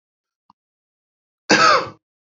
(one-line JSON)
{"cough_length": "2.4 s", "cough_amplitude": 32725, "cough_signal_mean_std_ratio": 0.31, "survey_phase": "beta (2021-08-13 to 2022-03-07)", "age": "18-44", "gender": "Male", "wearing_mask": "No", "symptom_none": true, "symptom_onset": "2 days", "smoker_status": "Never smoked", "respiratory_condition_asthma": false, "respiratory_condition_other": false, "recruitment_source": "REACT", "submission_delay": "1 day", "covid_test_result": "Negative", "covid_test_method": "RT-qPCR", "influenza_a_test_result": "Negative", "influenza_b_test_result": "Negative"}